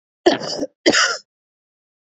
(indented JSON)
{
  "cough_length": "2.0 s",
  "cough_amplitude": 27479,
  "cough_signal_mean_std_ratio": 0.4,
  "survey_phase": "beta (2021-08-13 to 2022-03-07)",
  "age": "18-44",
  "gender": "Female",
  "wearing_mask": "No",
  "symptom_cough_any": true,
  "symptom_runny_or_blocked_nose": true,
  "symptom_shortness_of_breath": true,
  "symptom_sore_throat": true,
  "symptom_fatigue": true,
  "symptom_headache": true,
  "smoker_status": "Never smoked",
  "respiratory_condition_asthma": false,
  "respiratory_condition_other": false,
  "recruitment_source": "Test and Trace",
  "submission_delay": "2 days",
  "covid_test_result": "Positive",
  "covid_test_method": "RT-qPCR",
  "covid_ct_value": 27.6,
  "covid_ct_gene": "ORF1ab gene",
  "covid_ct_mean": 27.9,
  "covid_viral_load": "700 copies/ml",
  "covid_viral_load_category": "Minimal viral load (< 10K copies/ml)"
}